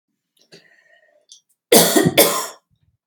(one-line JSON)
{"cough_length": "3.1 s", "cough_amplitude": 32768, "cough_signal_mean_std_ratio": 0.36, "survey_phase": "beta (2021-08-13 to 2022-03-07)", "age": "45-64", "gender": "Female", "wearing_mask": "No", "symptom_none": true, "smoker_status": "Never smoked", "respiratory_condition_asthma": false, "respiratory_condition_other": false, "recruitment_source": "REACT", "submission_delay": "1 day", "covid_test_result": "Negative", "covid_test_method": "RT-qPCR", "influenza_a_test_result": "Negative", "influenza_b_test_result": "Negative"}